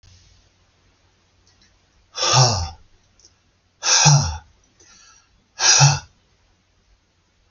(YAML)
exhalation_length: 7.5 s
exhalation_amplitude: 32768
exhalation_signal_mean_std_ratio: 0.35
survey_phase: alpha (2021-03-01 to 2021-08-12)
age: 45-64
gender: Male
wearing_mask: 'No'
symptom_none: true
smoker_status: Ex-smoker
respiratory_condition_asthma: false
respiratory_condition_other: false
recruitment_source: REACT
submission_delay: 1 day
covid_test_result: Negative
covid_test_method: RT-qPCR